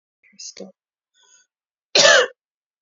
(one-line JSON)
{"cough_length": "2.8 s", "cough_amplitude": 29875, "cough_signal_mean_std_ratio": 0.28, "survey_phase": "beta (2021-08-13 to 2022-03-07)", "age": "18-44", "gender": "Female", "wearing_mask": "No", "symptom_none": true, "smoker_status": "Never smoked", "respiratory_condition_asthma": false, "respiratory_condition_other": false, "recruitment_source": "REACT", "submission_delay": "1 day", "covid_test_result": "Negative", "covid_test_method": "RT-qPCR"}